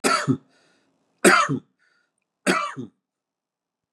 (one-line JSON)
{"three_cough_length": "3.9 s", "three_cough_amplitude": 28149, "three_cough_signal_mean_std_ratio": 0.36, "survey_phase": "beta (2021-08-13 to 2022-03-07)", "age": "45-64", "gender": "Male", "wearing_mask": "No", "symptom_none": true, "smoker_status": "Never smoked", "respiratory_condition_asthma": false, "respiratory_condition_other": false, "recruitment_source": "REACT", "submission_delay": "3 days", "covid_test_result": "Negative", "covid_test_method": "RT-qPCR", "influenza_a_test_result": "Negative", "influenza_b_test_result": "Negative"}